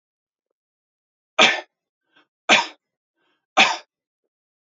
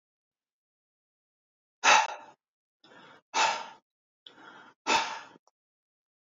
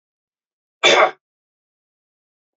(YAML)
three_cough_length: 4.7 s
three_cough_amplitude: 30835
three_cough_signal_mean_std_ratio: 0.25
exhalation_length: 6.3 s
exhalation_amplitude: 15642
exhalation_signal_mean_std_ratio: 0.27
cough_length: 2.6 s
cough_amplitude: 28631
cough_signal_mean_std_ratio: 0.25
survey_phase: beta (2021-08-13 to 2022-03-07)
age: 18-44
gender: Male
wearing_mask: 'No'
symptom_runny_or_blocked_nose: true
smoker_status: Never smoked
respiratory_condition_asthma: false
respiratory_condition_other: false
recruitment_source: REACT
submission_delay: 1 day
covid_test_result: Negative
covid_test_method: RT-qPCR